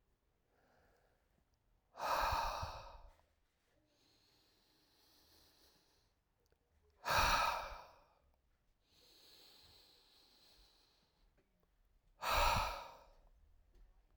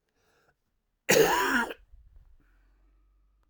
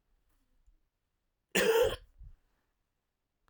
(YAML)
exhalation_length: 14.2 s
exhalation_amplitude: 2696
exhalation_signal_mean_std_ratio: 0.33
cough_length: 3.5 s
cough_amplitude: 13540
cough_signal_mean_std_ratio: 0.34
three_cough_length: 3.5 s
three_cough_amplitude: 6605
three_cough_signal_mean_std_ratio: 0.29
survey_phase: alpha (2021-03-01 to 2021-08-12)
age: 45-64
gender: Male
wearing_mask: 'No'
symptom_cough_any: true
symptom_fatigue: true
symptom_fever_high_temperature: true
smoker_status: Never smoked
respiratory_condition_asthma: false
respiratory_condition_other: false
recruitment_source: Test and Trace
submission_delay: 2 days
covid_test_result: Positive
covid_test_method: RT-qPCR
covid_ct_value: 20.6
covid_ct_gene: ORF1ab gene